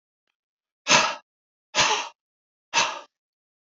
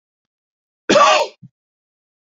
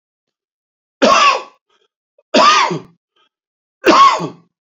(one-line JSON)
{"exhalation_length": "3.7 s", "exhalation_amplitude": 22789, "exhalation_signal_mean_std_ratio": 0.35, "cough_length": "2.4 s", "cough_amplitude": 28323, "cough_signal_mean_std_ratio": 0.32, "three_cough_length": "4.7 s", "three_cough_amplitude": 29899, "three_cough_signal_mean_std_ratio": 0.43, "survey_phase": "beta (2021-08-13 to 2022-03-07)", "age": "65+", "gender": "Male", "wearing_mask": "No", "symptom_none": true, "smoker_status": "Never smoked", "respiratory_condition_asthma": false, "respiratory_condition_other": false, "recruitment_source": "REACT", "submission_delay": "2 days", "covid_test_result": "Negative", "covid_test_method": "RT-qPCR"}